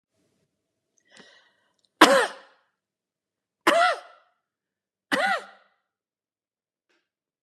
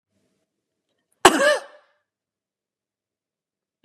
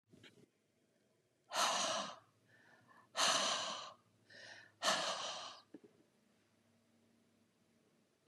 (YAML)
three_cough_length: 7.4 s
three_cough_amplitude: 31704
three_cough_signal_mean_std_ratio: 0.25
cough_length: 3.8 s
cough_amplitude: 32768
cough_signal_mean_std_ratio: 0.2
exhalation_length: 8.3 s
exhalation_amplitude: 3360
exhalation_signal_mean_std_ratio: 0.41
survey_phase: beta (2021-08-13 to 2022-03-07)
age: 45-64
gender: Female
wearing_mask: 'No'
symptom_sore_throat: true
symptom_headache: true
symptom_loss_of_taste: true
symptom_onset: 3 days
smoker_status: Never smoked
respiratory_condition_asthma: false
respiratory_condition_other: false
recruitment_source: Test and Trace
submission_delay: 2 days
covid_test_result: Positive
covid_test_method: RT-qPCR